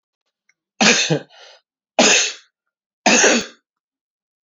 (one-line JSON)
{"three_cough_length": "4.5 s", "three_cough_amplitude": 30443, "three_cough_signal_mean_std_ratio": 0.4, "survey_phase": "beta (2021-08-13 to 2022-03-07)", "age": "65+", "gender": "Male", "wearing_mask": "No", "symptom_none": true, "smoker_status": "Ex-smoker", "respiratory_condition_asthma": false, "respiratory_condition_other": false, "recruitment_source": "REACT", "submission_delay": "2 days", "covid_test_result": "Negative", "covid_test_method": "RT-qPCR"}